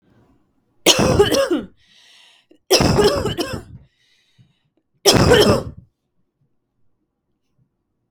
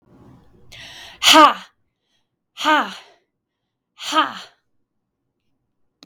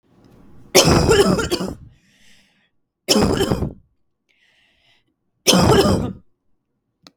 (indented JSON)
{
  "cough_length": "8.1 s",
  "cough_amplitude": 32768,
  "cough_signal_mean_std_ratio": 0.41,
  "exhalation_length": "6.1 s",
  "exhalation_amplitude": 32768,
  "exhalation_signal_mean_std_ratio": 0.27,
  "three_cough_length": "7.2 s",
  "three_cough_amplitude": 32768,
  "three_cough_signal_mean_std_ratio": 0.44,
  "survey_phase": "beta (2021-08-13 to 2022-03-07)",
  "age": "18-44",
  "gender": "Female",
  "wearing_mask": "No",
  "symptom_none": true,
  "smoker_status": "Ex-smoker",
  "respiratory_condition_asthma": false,
  "respiratory_condition_other": false,
  "recruitment_source": "REACT",
  "submission_delay": "1 day",
  "covid_test_result": "Negative",
  "covid_test_method": "RT-qPCR",
  "influenza_a_test_result": "Unknown/Void",
  "influenza_b_test_result": "Unknown/Void"
}